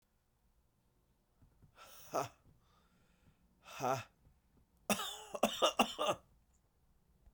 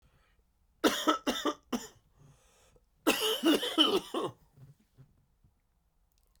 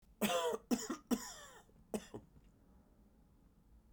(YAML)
exhalation_length: 7.3 s
exhalation_amplitude: 5099
exhalation_signal_mean_std_ratio: 0.31
three_cough_length: 6.4 s
three_cough_amplitude: 8338
three_cough_signal_mean_std_ratio: 0.4
cough_length: 3.9 s
cough_amplitude: 2874
cough_signal_mean_std_ratio: 0.41
survey_phase: beta (2021-08-13 to 2022-03-07)
age: 45-64
gender: Male
wearing_mask: 'Yes'
symptom_cough_any: true
symptom_shortness_of_breath: true
symptom_fatigue: true
symptom_fever_high_temperature: true
symptom_headache: true
symptom_change_to_sense_of_smell_or_taste: true
symptom_onset: 2 days
smoker_status: Never smoked
respiratory_condition_asthma: true
respiratory_condition_other: false
recruitment_source: Test and Trace
submission_delay: 1 day
covid_test_result: Positive
covid_test_method: RT-qPCR
covid_ct_value: 22.8
covid_ct_gene: ORF1ab gene
covid_ct_mean: 23.4
covid_viral_load: 22000 copies/ml
covid_viral_load_category: Low viral load (10K-1M copies/ml)